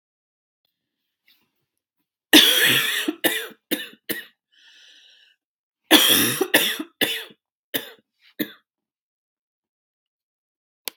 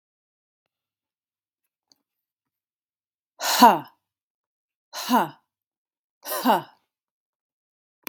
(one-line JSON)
{"cough_length": "11.0 s", "cough_amplitude": 32767, "cough_signal_mean_std_ratio": 0.32, "exhalation_length": "8.1 s", "exhalation_amplitude": 32767, "exhalation_signal_mean_std_ratio": 0.22, "survey_phase": "beta (2021-08-13 to 2022-03-07)", "age": "18-44", "gender": "Female", "wearing_mask": "No", "symptom_cough_any": true, "symptom_new_continuous_cough": true, "symptom_fever_high_temperature": true, "symptom_onset": "2 days", "smoker_status": "Never smoked", "respiratory_condition_asthma": true, "respiratory_condition_other": false, "recruitment_source": "Test and Trace", "submission_delay": "1 day", "covid_test_result": "Negative", "covid_test_method": "ePCR"}